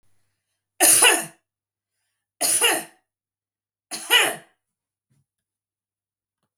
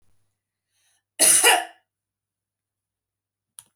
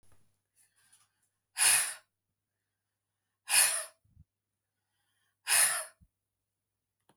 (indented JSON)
{
  "three_cough_length": "6.6 s",
  "three_cough_amplitude": 32768,
  "three_cough_signal_mean_std_ratio": 0.32,
  "cough_length": "3.8 s",
  "cough_amplitude": 25579,
  "cough_signal_mean_std_ratio": 0.27,
  "exhalation_length": "7.2 s",
  "exhalation_amplitude": 9524,
  "exhalation_signal_mean_std_ratio": 0.29,
  "survey_phase": "beta (2021-08-13 to 2022-03-07)",
  "age": "45-64",
  "gender": "Female",
  "wearing_mask": "No",
  "symptom_none": true,
  "smoker_status": "Never smoked",
  "respiratory_condition_asthma": false,
  "respiratory_condition_other": false,
  "recruitment_source": "Test and Trace",
  "submission_delay": "0 days",
  "covid_test_result": "Negative",
  "covid_test_method": "LFT"
}